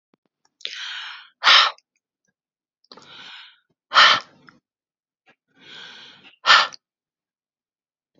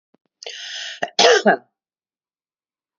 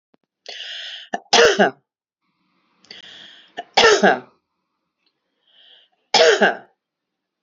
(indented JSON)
{
  "exhalation_length": "8.2 s",
  "exhalation_amplitude": 32218,
  "exhalation_signal_mean_std_ratio": 0.26,
  "cough_length": "3.0 s",
  "cough_amplitude": 29014,
  "cough_signal_mean_std_ratio": 0.32,
  "three_cough_length": "7.4 s",
  "three_cough_amplitude": 32470,
  "three_cough_signal_mean_std_ratio": 0.34,
  "survey_phase": "beta (2021-08-13 to 2022-03-07)",
  "age": "45-64",
  "gender": "Female",
  "wearing_mask": "No",
  "symptom_none": true,
  "smoker_status": "Ex-smoker",
  "respiratory_condition_asthma": false,
  "respiratory_condition_other": false,
  "recruitment_source": "REACT",
  "submission_delay": "2 days",
  "covid_test_result": "Negative",
  "covid_test_method": "RT-qPCR"
}